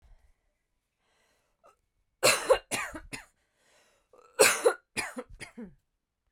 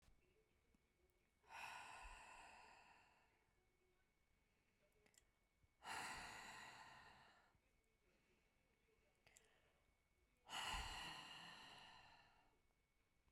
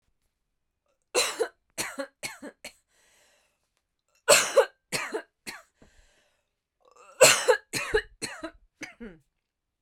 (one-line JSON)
{"cough_length": "6.3 s", "cough_amplitude": 15818, "cough_signal_mean_std_ratio": 0.28, "exhalation_length": "13.3 s", "exhalation_amplitude": 450, "exhalation_signal_mean_std_ratio": 0.48, "three_cough_length": "9.8 s", "three_cough_amplitude": 22857, "three_cough_signal_mean_std_ratio": 0.29, "survey_phase": "beta (2021-08-13 to 2022-03-07)", "age": "18-44", "gender": "Female", "wearing_mask": "No", "symptom_shortness_of_breath": true, "symptom_sore_throat": true, "symptom_fatigue": true, "symptom_onset": "12 days", "smoker_status": "Ex-smoker", "respiratory_condition_asthma": true, "respiratory_condition_other": true, "recruitment_source": "REACT", "submission_delay": "1 day", "covid_test_result": "Negative", "covid_test_method": "RT-qPCR"}